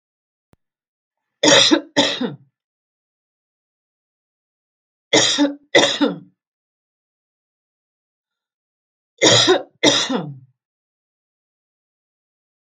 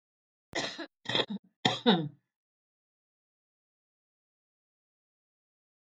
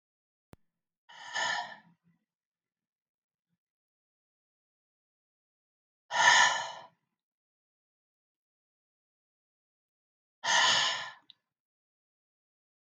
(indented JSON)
{
  "three_cough_length": "12.6 s",
  "three_cough_amplitude": 32768,
  "three_cough_signal_mean_std_ratio": 0.32,
  "cough_length": "5.8 s",
  "cough_amplitude": 14190,
  "cough_signal_mean_std_ratio": 0.26,
  "exhalation_length": "12.9 s",
  "exhalation_amplitude": 11640,
  "exhalation_signal_mean_std_ratio": 0.25,
  "survey_phase": "beta (2021-08-13 to 2022-03-07)",
  "age": "65+",
  "gender": "Female",
  "wearing_mask": "No",
  "symptom_runny_or_blocked_nose": true,
  "smoker_status": "Never smoked",
  "respiratory_condition_asthma": false,
  "respiratory_condition_other": false,
  "recruitment_source": "REACT",
  "submission_delay": "3 days",
  "covid_test_result": "Negative",
  "covid_test_method": "RT-qPCR",
  "influenza_a_test_result": "Negative",
  "influenza_b_test_result": "Negative"
}